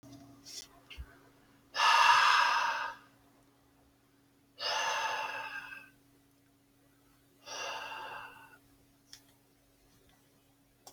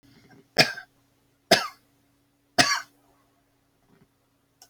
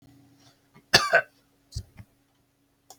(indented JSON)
{
  "exhalation_length": "10.9 s",
  "exhalation_amplitude": 8603,
  "exhalation_signal_mean_std_ratio": 0.38,
  "three_cough_length": "4.7 s",
  "three_cough_amplitude": 25766,
  "three_cough_signal_mean_std_ratio": 0.23,
  "cough_length": "3.0 s",
  "cough_amplitude": 25683,
  "cough_signal_mean_std_ratio": 0.23,
  "survey_phase": "beta (2021-08-13 to 2022-03-07)",
  "age": "45-64",
  "gender": "Male",
  "wearing_mask": "No",
  "symptom_none": true,
  "smoker_status": "Never smoked",
  "respiratory_condition_asthma": false,
  "respiratory_condition_other": false,
  "recruitment_source": "REACT",
  "submission_delay": "2 days",
  "covid_test_result": "Negative",
  "covid_test_method": "RT-qPCR"
}